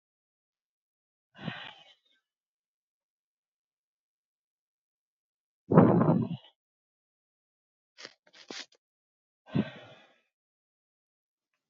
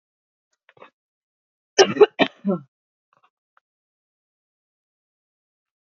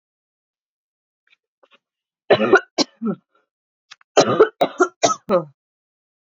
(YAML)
exhalation_length: 11.7 s
exhalation_amplitude: 20311
exhalation_signal_mean_std_ratio: 0.2
cough_length: 5.8 s
cough_amplitude: 30074
cough_signal_mean_std_ratio: 0.18
three_cough_length: 6.2 s
three_cough_amplitude: 30853
three_cough_signal_mean_std_ratio: 0.31
survey_phase: beta (2021-08-13 to 2022-03-07)
age: 18-44
gender: Female
wearing_mask: 'No'
symptom_new_continuous_cough: true
symptom_runny_or_blocked_nose: true
symptom_shortness_of_breath: true
symptom_sore_throat: true
symptom_fatigue: true
symptom_fever_high_temperature: true
symptom_headache: true
symptom_onset: 2 days
smoker_status: Current smoker (1 to 10 cigarettes per day)
respiratory_condition_asthma: false
respiratory_condition_other: false
recruitment_source: Test and Trace
submission_delay: 2 days
covid_test_result: Positive
covid_test_method: RT-qPCR
covid_ct_value: 16.6
covid_ct_gene: N gene